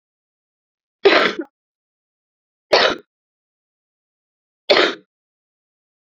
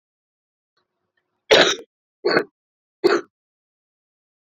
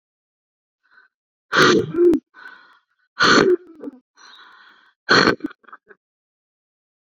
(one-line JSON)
{"three_cough_length": "6.1 s", "three_cough_amplitude": 29902, "three_cough_signal_mean_std_ratio": 0.27, "cough_length": "4.5 s", "cough_amplitude": 30773, "cough_signal_mean_std_ratio": 0.27, "exhalation_length": "7.1 s", "exhalation_amplitude": 28664, "exhalation_signal_mean_std_ratio": 0.36, "survey_phase": "beta (2021-08-13 to 2022-03-07)", "age": "18-44", "gender": "Female", "wearing_mask": "No", "symptom_cough_any": true, "symptom_runny_or_blocked_nose": true, "symptom_fatigue": true, "symptom_headache": true, "symptom_change_to_sense_of_smell_or_taste": true, "symptom_onset": "3 days", "smoker_status": "Never smoked", "respiratory_condition_asthma": false, "respiratory_condition_other": false, "recruitment_source": "Test and Trace", "submission_delay": "1 day", "covid_test_result": "Positive", "covid_test_method": "RT-qPCR", "covid_ct_value": 20.5, "covid_ct_gene": "ORF1ab gene", "covid_ct_mean": 21.2, "covid_viral_load": "110000 copies/ml", "covid_viral_load_category": "Low viral load (10K-1M copies/ml)"}